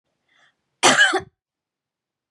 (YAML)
cough_length: 2.3 s
cough_amplitude: 27815
cough_signal_mean_std_ratio: 0.31
survey_phase: beta (2021-08-13 to 2022-03-07)
age: 18-44
gender: Female
wearing_mask: 'No'
symptom_runny_or_blocked_nose: true
symptom_shortness_of_breath: true
symptom_fatigue: true
symptom_headache: true
symptom_onset: 3 days
smoker_status: Ex-smoker
respiratory_condition_asthma: true
respiratory_condition_other: false
recruitment_source: REACT
submission_delay: 1 day
covid_test_result: Negative
covid_test_method: RT-qPCR
influenza_a_test_result: Negative
influenza_b_test_result: Negative